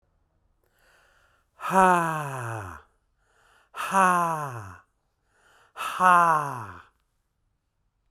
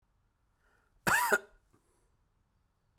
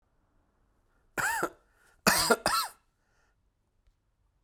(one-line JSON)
{"exhalation_length": "8.1 s", "exhalation_amplitude": 18692, "exhalation_signal_mean_std_ratio": 0.38, "cough_length": "3.0 s", "cough_amplitude": 7698, "cough_signal_mean_std_ratio": 0.27, "three_cough_length": "4.4 s", "three_cough_amplitude": 13368, "three_cough_signal_mean_std_ratio": 0.33, "survey_phase": "beta (2021-08-13 to 2022-03-07)", "age": "45-64", "gender": "Male", "wearing_mask": "No", "symptom_cough_any": true, "symptom_fatigue": true, "symptom_headache": true, "smoker_status": "Never smoked", "respiratory_condition_asthma": false, "respiratory_condition_other": false, "recruitment_source": "REACT", "submission_delay": "1 day", "covid_test_result": "Negative", "covid_test_method": "RT-qPCR", "covid_ct_value": 38.0, "covid_ct_gene": "N gene"}